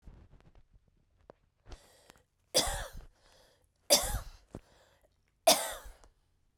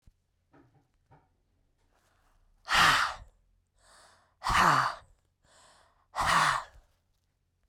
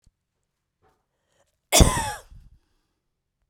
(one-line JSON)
{"three_cough_length": "6.6 s", "three_cough_amplitude": 11741, "three_cough_signal_mean_std_ratio": 0.27, "exhalation_length": "7.7 s", "exhalation_amplitude": 11275, "exhalation_signal_mean_std_ratio": 0.35, "cough_length": "3.5 s", "cough_amplitude": 32767, "cough_signal_mean_std_ratio": 0.22, "survey_phase": "beta (2021-08-13 to 2022-03-07)", "age": "45-64", "gender": "Female", "wearing_mask": "No", "symptom_runny_or_blocked_nose": true, "symptom_sore_throat": true, "symptom_fatigue": true, "smoker_status": "Never smoked", "respiratory_condition_asthma": false, "respiratory_condition_other": false, "recruitment_source": "Test and Trace", "submission_delay": "3 days", "covid_test_result": "Negative", "covid_test_method": "ePCR"}